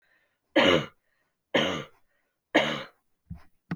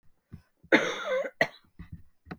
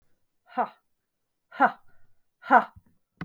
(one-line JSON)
{"three_cough_length": "3.8 s", "three_cough_amplitude": 13827, "three_cough_signal_mean_std_ratio": 0.36, "cough_length": "2.4 s", "cough_amplitude": 15980, "cough_signal_mean_std_ratio": 0.38, "exhalation_length": "3.2 s", "exhalation_amplitude": 21373, "exhalation_signal_mean_std_ratio": 0.24, "survey_phase": "beta (2021-08-13 to 2022-03-07)", "age": "45-64", "gender": "Female", "wearing_mask": "No", "symptom_cough_any": true, "symptom_runny_or_blocked_nose": true, "symptom_sore_throat": true, "symptom_fatigue": true, "symptom_headache": true, "smoker_status": "Never smoked", "respiratory_condition_asthma": false, "respiratory_condition_other": false, "recruitment_source": "Test and Trace", "submission_delay": "2 days", "covid_test_result": "Positive", "covid_test_method": "LFT"}